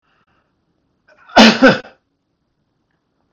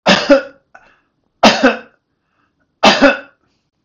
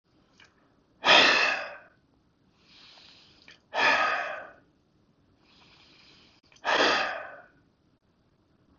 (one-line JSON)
{"cough_length": "3.3 s", "cough_amplitude": 32768, "cough_signal_mean_std_ratio": 0.27, "three_cough_length": "3.8 s", "three_cough_amplitude": 32768, "three_cough_signal_mean_std_ratio": 0.39, "exhalation_length": "8.8 s", "exhalation_amplitude": 17164, "exhalation_signal_mean_std_ratio": 0.36, "survey_phase": "beta (2021-08-13 to 2022-03-07)", "age": "65+", "gender": "Male", "wearing_mask": "No", "symptom_none": true, "smoker_status": "Ex-smoker", "respiratory_condition_asthma": false, "respiratory_condition_other": false, "recruitment_source": "REACT", "submission_delay": "1 day", "covid_test_result": "Negative", "covid_test_method": "RT-qPCR", "influenza_a_test_result": "Negative", "influenza_b_test_result": "Negative"}